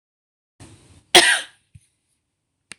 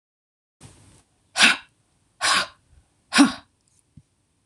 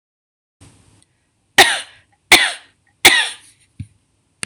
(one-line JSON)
{"cough_length": "2.8 s", "cough_amplitude": 26028, "cough_signal_mean_std_ratio": 0.23, "exhalation_length": "4.5 s", "exhalation_amplitude": 25534, "exhalation_signal_mean_std_ratio": 0.28, "three_cough_length": "4.5 s", "three_cough_amplitude": 26028, "three_cough_signal_mean_std_ratio": 0.29, "survey_phase": "beta (2021-08-13 to 2022-03-07)", "age": "45-64", "gender": "Female", "wearing_mask": "No", "symptom_none": true, "smoker_status": "Never smoked", "respiratory_condition_asthma": false, "respiratory_condition_other": false, "recruitment_source": "REACT", "submission_delay": "2 days", "covid_test_result": "Negative", "covid_test_method": "RT-qPCR", "influenza_a_test_result": "Negative", "influenza_b_test_result": "Negative"}